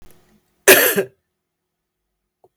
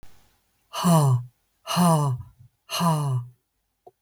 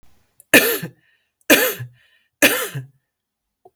{"cough_length": "2.6 s", "cough_amplitude": 32768, "cough_signal_mean_std_ratio": 0.28, "exhalation_length": "4.0 s", "exhalation_amplitude": 12397, "exhalation_signal_mean_std_ratio": 0.57, "three_cough_length": "3.8 s", "three_cough_amplitude": 32768, "three_cough_signal_mean_std_ratio": 0.34, "survey_phase": "beta (2021-08-13 to 2022-03-07)", "age": "45-64", "gender": "Female", "wearing_mask": "No", "symptom_cough_any": true, "symptom_runny_or_blocked_nose": true, "symptom_fatigue": true, "symptom_headache": true, "symptom_change_to_sense_of_smell_or_taste": true, "symptom_other": true, "symptom_onset": "4 days", "smoker_status": "Ex-smoker", "respiratory_condition_asthma": false, "respiratory_condition_other": false, "recruitment_source": "Test and Trace", "submission_delay": "1 day", "covid_test_result": "Positive", "covid_test_method": "RT-qPCR", "covid_ct_value": 30.6, "covid_ct_gene": "ORF1ab gene"}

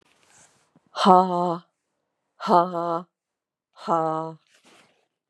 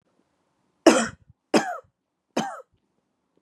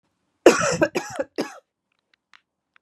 {"exhalation_length": "5.3 s", "exhalation_amplitude": 30825, "exhalation_signal_mean_std_ratio": 0.34, "three_cough_length": "3.4 s", "three_cough_amplitude": 29461, "three_cough_signal_mean_std_ratio": 0.26, "cough_length": "2.8 s", "cough_amplitude": 32767, "cough_signal_mean_std_ratio": 0.3, "survey_phase": "beta (2021-08-13 to 2022-03-07)", "age": "45-64", "gender": "Female", "wearing_mask": "No", "symptom_cough_any": true, "symptom_runny_or_blocked_nose": true, "symptom_sore_throat": true, "symptom_fatigue": true, "symptom_fever_high_temperature": true, "symptom_headache": true, "symptom_change_to_sense_of_smell_or_taste": true, "smoker_status": "Never smoked", "respiratory_condition_asthma": false, "respiratory_condition_other": false, "recruitment_source": "Test and Trace", "submission_delay": "2 days", "covid_test_result": "Positive", "covid_test_method": "RT-qPCR", "covid_ct_value": 17.1, "covid_ct_gene": "ORF1ab gene", "covid_ct_mean": 17.6, "covid_viral_load": "1700000 copies/ml", "covid_viral_load_category": "High viral load (>1M copies/ml)"}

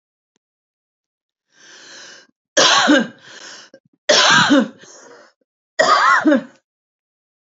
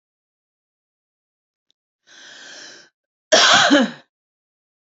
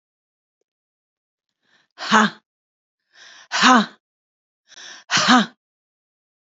{"three_cough_length": "7.4 s", "three_cough_amplitude": 32767, "three_cough_signal_mean_std_ratio": 0.42, "cough_length": "4.9 s", "cough_amplitude": 32767, "cough_signal_mean_std_ratio": 0.29, "exhalation_length": "6.6 s", "exhalation_amplitude": 29373, "exhalation_signal_mean_std_ratio": 0.29, "survey_phase": "alpha (2021-03-01 to 2021-08-12)", "age": "45-64", "gender": "Female", "wearing_mask": "No", "symptom_none": true, "smoker_status": "Ex-smoker", "respiratory_condition_asthma": false, "respiratory_condition_other": false, "recruitment_source": "REACT", "submission_delay": "2 days", "covid_test_result": "Negative", "covid_test_method": "RT-qPCR"}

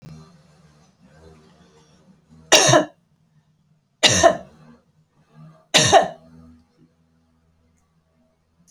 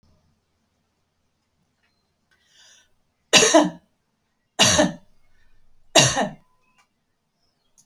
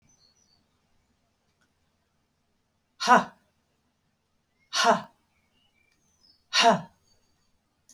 {"cough_length": "8.7 s", "cough_amplitude": 32768, "cough_signal_mean_std_ratio": 0.28, "three_cough_length": "7.9 s", "three_cough_amplitude": 32768, "three_cough_signal_mean_std_ratio": 0.28, "exhalation_length": "7.9 s", "exhalation_amplitude": 19040, "exhalation_signal_mean_std_ratio": 0.23, "survey_phase": "alpha (2021-03-01 to 2021-08-12)", "age": "45-64", "gender": "Female", "wearing_mask": "No", "symptom_none": true, "smoker_status": "Never smoked", "respiratory_condition_asthma": false, "respiratory_condition_other": false, "recruitment_source": "REACT", "submission_delay": "1 day", "covid_test_result": "Negative", "covid_test_method": "RT-qPCR"}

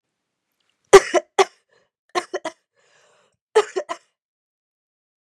{"three_cough_length": "5.2 s", "three_cough_amplitude": 32768, "three_cough_signal_mean_std_ratio": 0.2, "survey_phase": "beta (2021-08-13 to 2022-03-07)", "age": "18-44", "gender": "Female", "wearing_mask": "No", "symptom_runny_or_blocked_nose": true, "symptom_onset": "15 days", "smoker_status": "Never smoked", "respiratory_condition_asthma": false, "respiratory_condition_other": false, "recruitment_source": "Test and Trace", "submission_delay": "14 days", "covid_test_result": "Negative", "covid_test_method": "ePCR"}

